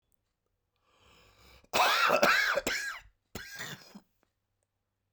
{"cough_length": "5.1 s", "cough_amplitude": 10945, "cough_signal_mean_std_ratio": 0.41, "survey_phase": "beta (2021-08-13 to 2022-03-07)", "age": "45-64", "gender": "Male", "wearing_mask": "No", "symptom_cough_any": true, "symptom_runny_or_blocked_nose": true, "symptom_fatigue": true, "symptom_fever_high_temperature": true, "symptom_headache": true, "symptom_change_to_sense_of_smell_or_taste": true, "smoker_status": "Never smoked", "respiratory_condition_asthma": false, "respiratory_condition_other": false, "recruitment_source": "Test and Trace", "submission_delay": "2 days", "covid_test_result": "Positive", "covid_test_method": "LFT"}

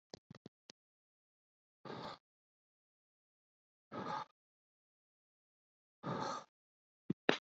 {"exhalation_length": "7.5 s", "exhalation_amplitude": 10182, "exhalation_signal_mean_std_ratio": 0.23, "survey_phase": "beta (2021-08-13 to 2022-03-07)", "age": "18-44", "gender": "Male", "wearing_mask": "No", "symptom_none": true, "smoker_status": "Never smoked", "respiratory_condition_asthma": false, "respiratory_condition_other": false, "recruitment_source": "REACT", "submission_delay": "4 days", "covid_test_result": "Negative", "covid_test_method": "RT-qPCR"}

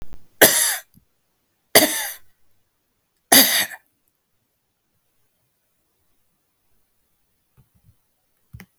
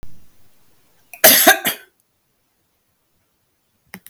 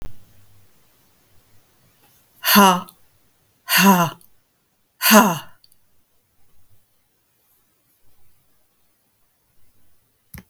{"three_cough_length": "8.8 s", "three_cough_amplitude": 32768, "three_cough_signal_mean_std_ratio": 0.25, "cough_length": "4.1 s", "cough_amplitude": 32768, "cough_signal_mean_std_ratio": 0.28, "exhalation_length": "10.5 s", "exhalation_amplitude": 32768, "exhalation_signal_mean_std_ratio": 0.27, "survey_phase": "beta (2021-08-13 to 2022-03-07)", "age": "45-64", "gender": "Female", "wearing_mask": "No", "symptom_none": true, "smoker_status": "Never smoked", "respiratory_condition_asthma": false, "respiratory_condition_other": false, "recruitment_source": "REACT", "submission_delay": "2 days", "covid_test_result": "Negative", "covid_test_method": "RT-qPCR", "influenza_a_test_result": "Negative", "influenza_b_test_result": "Negative"}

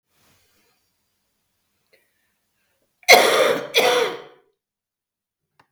{"cough_length": "5.7 s", "cough_amplitude": 32768, "cough_signal_mean_std_ratio": 0.3, "survey_phase": "beta (2021-08-13 to 2022-03-07)", "age": "45-64", "gender": "Female", "wearing_mask": "No", "symptom_cough_any": true, "symptom_runny_or_blocked_nose": true, "symptom_onset": "3 days", "smoker_status": "Current smoker (1 to 10 cigarettes per day)", "respiratory_condition_asthma": false, "respiratory_condition_other": false, "recruitment_source": "REACT", "submission_delay": "13 days", "covid_test_result": "Negative", "covid_test_method": "RT-qPCR"}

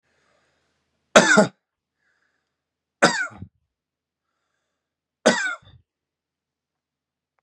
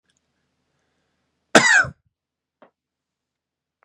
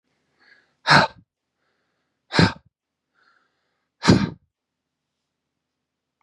{"three_cough_length": "7.4 s", "three_cough_amplitude": 32767, "three_cough_signal_mean_std_ratio": 0.23, "cough_length": "3.8 s", "cough_amplitude": 32768, "cough_signal_mean_std_ratio": 0.22, "exhalation_length": "6.2 s", "exhalation_amplitude": 28881, "exhalation_signal_mean_std_ratio": 0.23, "survey_phase": "beta (2021-08-13 to 2022-03-07)", "age": "18-44", "gender": "Male", "wearing_mask": "No", "symptom_runny_or_blocked_nose": true, "symptom_fatigue": true, "symptom_headache": true, "smoker_status": "Never smoked", "respiratory_condition_asthma": false, "respiratory_condition_other": false, "recruitment_source": "Test and Trace", "submission_delay": "1 day", "covid_test_result": "Positive", "covid_test_method": "LFT"}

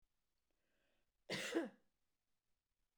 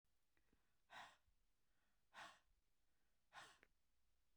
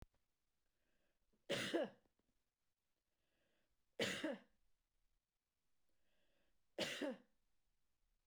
{"cough_length": "3.0 s", "cough_amplitude": 1559, "cough_signal_mean_std_ratio": 0.29, "exhalation_length": "4.4 s", "exhalation_amplitude": 165, "exhalation_signal_mean_std_ratio": 0.52, "three_cough_length": "8.3 s", "three_cough_amplitude": 1206, "three_cough_signal_mean_std_ratio": 0.31, "survey_phase": "beta (2021-08-13 to 2022-03-07)", "age": "45-64", "gender": "Female", "wearing_mask": "No", "symptom_runny_or_blocked_nose": true, "symptom_headache": true, "smoker_status": "Ex-smoker", "respiratory_condition_asthma": false, "respiratory_condition_other": false, "recruitment_source": "REACT", "submission_delay": "1 day", "covid_test_result": "Negative", "covid_test_method": "RT-qPCR"}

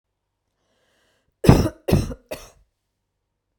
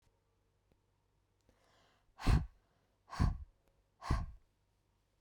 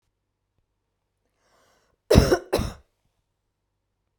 {"three_cough_length": "3.6 s", "three_cough_amplitude": 32768, "three_cough_signal_mean_std_ratio": 0.25, "exhalation_length": "5.2 s", "exhalation_amplitude": 3784, "exhalation_signal_mean_std_ratio": 0.27, "cough_length": "4.2 s", "cough_amplitude": 32768, "cough_signal_mean_std_ratio": 0.22, "survey_phase": "beta (2021-08-13 to 2022-03-07)", "age": "45-64", "gender": "Female", "wearing_mask": "No", "symptom_sore_throat": true, "symptom_fatigue": true, "symptom_onset": "12 days", "smoker_status": "Never smoked", "respiratory_condition_asthma": false, "respiratory_condition_other": false, "recruitment_source": "REACT", "submission_delay": "1 day", "covid_test_result": "Negative", "covid_test_method": "RT-qPCR"}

